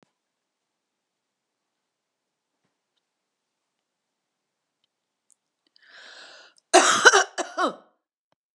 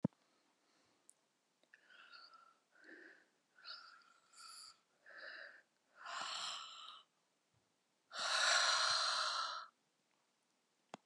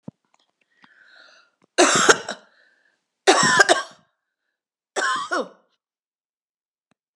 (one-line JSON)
{"cough_length": "8.5 s", "cough_amplitude": 31997, "cough_signal_mean_std_ratio": 0.2, "exhalation_length": "11.1 s", "exhalation_amplitude": 2621, "exhalation_signal_mean_std_ratio": 0.39, "three_cough_length": "7.2 s", "three_cough_amplitude": 32768, "three_cough_signal_mean_std_ratio": 0.32, "survey_phase": "beta (2021-08-13 to 2022-03-07)", "age": "65+", "gender": "Female", "wearing_mask": "No", "symptom_none": true, "smoker_status": "Never smoked", "respiratory_condition_asthma": false, "respiratory_condition_other": false, "recruitment_source": "REACT", "submission_delay": "2 days", "covid_test_result": "Negative", "covid_test_method": "RT-qPCR"}